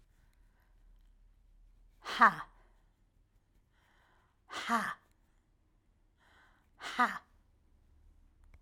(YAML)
exhalation_length: 8.6 s
exhalation_amplitude: 11073
exhalation_signal_mean_std_ratio: 0.22
survey_phase: beta (2021-08-13 to 2022-03-07)
age: 65+
gender: Female
wearing_mask: 'No'
symptom_none: true
smoker_status: Never smoked
respiratory_condition_asthma: false
respiratory_condition_other: false
recruitment_source: REACT
submission_delay: 2 days
covid_test_result: Negative
covid_test_method: RT-qPCR
influenza_a_test_result: Negative
influenza_b_test_result: Negative